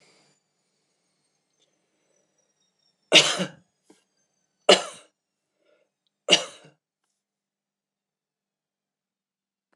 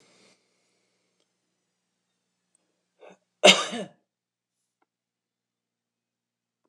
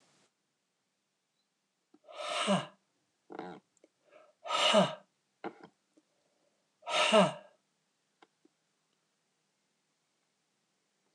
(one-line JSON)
{"three_cough_length": "9.8 s", "three_cough_amplitude": 26028, "three_cough_signal_mean_std_ratio": 0.17, "cough_length": "6.7 s", "cough_amplitude": 26028, "cough_signal_mean_std_ratio": 0.14, "exhalation_length": "11.1 s", "exhalation_amplitude": 9197, "exhalation_signal_mean_std_ratio": 0.27, "survey_phase": "beta (2021-08-13 to 2022-03-07)", "age": "65+", "gender": "Female", "wearing_mask": "No", "symptom_runny_or_blocked_nose": true, "symptom_onset": "10 days", "smoker_status": "Never smoked", "respiratory_condition_asthma": false, "respiratory_condition_other": false, "recruitment_source": "REACT", "submission_delay": "1 day", "covid_test_result": "Negative", "covid_test_method": "RT-qPCR", "influenza_a_test_result": "Negative", "influenza_b_test_result": "Negative"}